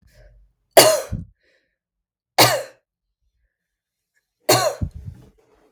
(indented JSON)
{
  "three_cough_length": "5.7 s",
  "three_cough_amplitude": 32768,
  "three_cough_signal_mean_std_ratio": 0.29,
  "survey_phase": "beta (2021-08-13 to 2022-03-07)",
  "age": "18-44",
  "gender": "Female",
  "wearing_mask": "No",
  "symptom_cough_any": true,
  "symptom_fatigue": true,
  "symptom_other": true,
  "smoker_status": "Ex-smoker",
  "respiratory_condition_asthma": false,
  "respiratory_condition_other": false,
  "recruitment_source": "REACT",
  "submission_delay": "1 day",
  "covid_test_result": "Negative",
  "covid_test_method": "RT-qPCR"
}